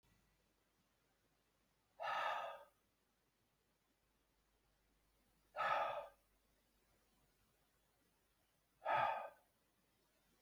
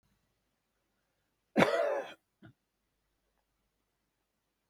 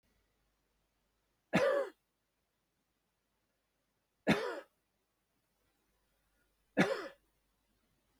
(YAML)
exhalation_length: 10.4 s
exhalation_amplitude: 1411
exhalation_signal_mean_std_ratio: 0.31
cough_length: 4.7 s
cough_amplitude: 12363
cough_signal_mean_std_ratio: 0.24
three_cough_length: 8.2 s
three_cough_amplitude: 5809
three_cough_signal_mean_std_ratio: 0.25
survey_phase: beta (2021-08-13 to 2022-03-07)
age: 65+
gender: Male
wearing_mask: 'No'
symptom_none: true
smoker_status: Never smoked
respiratory_condition_asthma: false
respiratory_condition_other: false
recruitment_source: REACT
submission_delay: 4 days
covid_test_result: Negative
covid_test_method: RT-qPCR
influenza_a_test_result: Negative
influenza_b_test_result: Negative